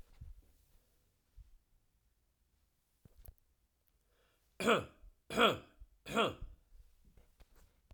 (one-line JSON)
{"three_cough_length": "7.9 s", "three_cough_amplitude": 4499, "three_cough_signal_mean_std_ratio": 0.26, "survey_phase": "beta (2021-08-13 to 2022-03-07)", "age": "18-44", "gender": "Male", "wearing_mask": "No", "symptom_cough_any": true, "symptom_runny_or_blocked_nose": true, "symptom_fatigue": true, "symptom_fever_high_temperature": true, "symptom_loss_of_taste": true, "symptom_onset": "3 days", "smoker_status": "Never smoked", "respiratory_condition_asthma": false, "respiratory_condition_other": false, "recruitment_source": "Test and Trace", "submission_delay": "2 days", "covid_test_result": "Positive", "covid_test_method": "RT-qPCR"}